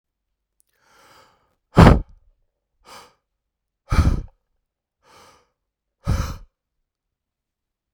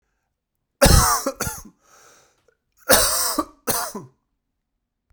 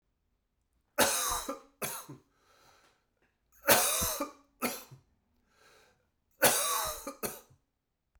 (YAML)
exhalation_length: 7.9 s
exhalation_amplitude: 32768
exhalation_signal_mean_std_ratio: 0.21
cough_length: 5.1 s
cough_amplitude: 32768
cough_signal_mean_std_ratio: 0.38
three_cough_length: 8.2 s
three_cough_amplitude: 13377
three_cough_signal_mean_std_ratio: 0.38
survey_phase: beta (2021-08-13 to 2022-03-07)
age: 18-44
gender: Male
wearing_mask: 'No'
symptom_new_continuous_cough: true
symptom_runny_or_blocked_nose: true
symptom_fatigue: true
symptom_fever_high_temperature: true
symptom_headache: true
symptom_onset: 3 days
smoker_status: Never smoked
respiratory_condition_asthma: false
respiratory_condition_other: false
recruitment_source: Test and Trace
submission_delay: 2 days
covid_test_method: RT-qPCR
covid_ct_value: 30.9
covid_ct_gene: ORF1ab gene